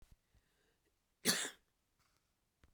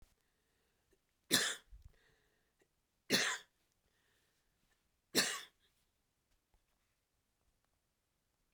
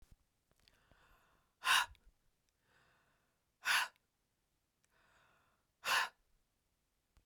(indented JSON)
{
  "cough_length": "2.7 s",
  "cough_amplitude": 4280,
  "cough_signal_mean_std_ratio": 0.23,
  "three_cough_length": "8.5 s",
  "three_cough_amplitude": 6435,
  "three_cough_signal_mean_std_ratio": 0.23,
  "exhalation_length": "7.3 s",
  "exhalation_amplitude": 3754,
  "exhalation_signal_mean_std_ratio": 0.25,
  "survey_phase": "beta (2021-08-13 to 2022-03-07)",
  "age": "65+",
  "gender": "Female",
  "wearing_mask": "No",
  "symptom_cough_any": true,
  "smoker_status": "Never smoked",
  "respiratory_condition_asthma": true,
  "respiratory_condition_other": false,
  "recruitment_source": "Test and Trace",
  "submission_delay": "1 day",
  "covid_test_result": "Negative",
  "covid_test_method": "RT-qPCR"
}